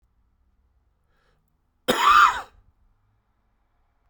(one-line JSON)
{"cough_length": "4.1 s", "cough_amplitude": 20010, "cough_signal_mean_std_ratio": 0.27, "survey_phase": "beta (2021-08-13 to 2022-03-07)", "age": "18-44", "gender": "Male", "wearing_mask": "No", "symptom_cough_any": true, "symptom_new_continuous_cough": true, "symptom_runny_or_blocked_nose": true, "symptom_shortness_of_breath": true, "symptom_fatigue": true, "symptom_fever_high_temperature": true, "symptom_onset": "3 days", "smoker_status": "Ex-smoker", "respiratory_condition_asthma": false, "respiratory_condition_other": false, "recruitment_source": "Test and Trace", "submission_delay": "2 days", "covid_test_result": "Positive", "covid_test_method": "RT-qPCR", "covid_ct_value": 14.8, "covid_ct_gene": "ORF1ab gene", "covid_ct_mean": 15.9, "covid_viral_load": "6000000 copies/ml", "covid_viral_load_category": "High viral load (>1M copies/ml)"}